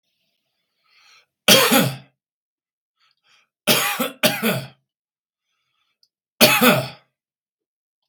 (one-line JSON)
{"three_cough_length": "8.1 s", "three_cough_amplitude": 32768, "three_cough_signal_mean_std_ratio": 0.34, "survey_phase": "beta (2021-08-13 to 2022-03-07)", "age": "65+", "gender": "Male", "wearing_mask": "No", "symptom_cough_any": true, "smoker_status": "Never smoked", "respiratory_condition_asthma": false, "respiratory_condition_other": false, "recruitment_source": "REACT", "submission_delay": "11 days", "covid_test_result": "Negative", "covid_test_method": "RT-qPCR", "influenza_a_test_result": "Negative", "influenza_b_test_result": "Negative"}